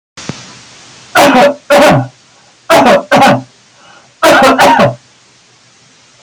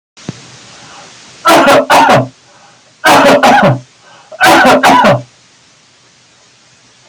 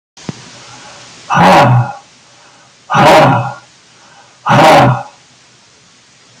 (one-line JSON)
{"three_cough_length": "6.2 s", "three_cough_amplitude": 32768, "three_cough_signal_mean_std_ratio": 0.61, "cough_length": "7.1 s", "cough_amplitude": 32768, "cough_signal_mean_std_ratio": 0.6, "exhalation_length": "6.4 s", "exhalation_amplitude": 32768, "exhalation_signal_mean_std_ratio": 0.52, "survey_phase": "alpha (2021-03-01 to 2021-08-12)", "age": "65+", "gender": "Male", "wearing_mask": "No", "symptom_none": true, "smoker_status": "Never smoked", "respiratory_condition_asthma": false, "respiratory_condition_other": false, "recruitment_source": "REACT", "submission_delay": "1 day", "covid_test_result": "Negative", "covid_test_method": "RT-qPCR"}